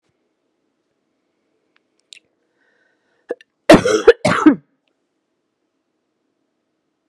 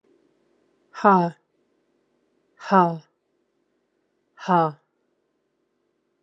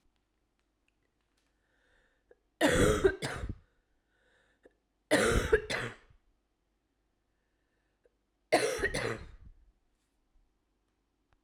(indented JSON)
{
  "cough_length": "7.1 s",
  "cough_amplitude": 32768,
  "cough_signal_mean_std_ratio": 0.21,
  "exhalation_length": "6.2 s",
  "exhalation_amplitude": 26504,
  "exhalation_signal_mean_std_ratio": 0.25,
  "three_cough_length": "11.4 s",
  "three_cough_amplitude": 8062,
  "three_cough_signal_mean_std_ratio": 0.32,
  "survey_phase": "alpha (2021-03-01 to 2021-08-12)",
  "age": "45-64",
  "gender": "Female",
  "wearing_mask": "No",
  "symptom_cough_any": true,
  "symptom_fatigue": true,
  "symptom_headache": true,
  "symptom_onset": "3 days",
  "smoker_status": "Never smoked",
  "respiratory_condition_asthma": false,
  "respiratory_condition_other": false,
  "recruitment_source": "Test and Trace",
  "submission_delay": "2 days",
  "covid_test_result": "Positive",
  "covid_test_method": "RT-qPCR",
  "covid_ct_value": 15.9,
  "covid_ct_gene": "ORF1ab gene",
  "covid_ct_mean": 17.3,
  "covid_viral_load": "2100000 copies/ml",
  "covid_viral_load_category": "High viral load (>1M copies/ml)"
}